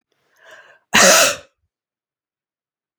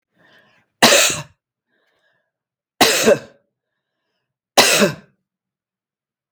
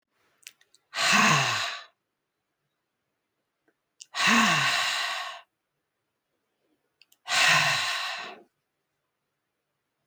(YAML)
cough_length: 3.0 s
cough_amplitude: 32768
cough_signal_mean_std_ratio: 0.3
three_cough_length: 6.3 s
three_cough_amplitude: 32768
three_cough_signal_mean_std_ratio: 0.32
exhalation_length: 10.1 s
exhalation_amplitude: 12411
exhalation_signal_mean_std_ratio: 0.43
survey_phase: beta (2021-08-13 to 2022-03-07)
age: 65+
gender: Female
wearing_mask: 'No'
symptom_none: true
smoker_status: Never smoked
respiratory_condition_asthma: false
respiratory_condition_other: false
recruitment_source: REACT
submission_delay: 2 days
covid_test_result: Negative
covid_test_method: RT-qPCR
influenza_a_test_result: Unknown/Void
influenza_b_test_result: Unknown/Void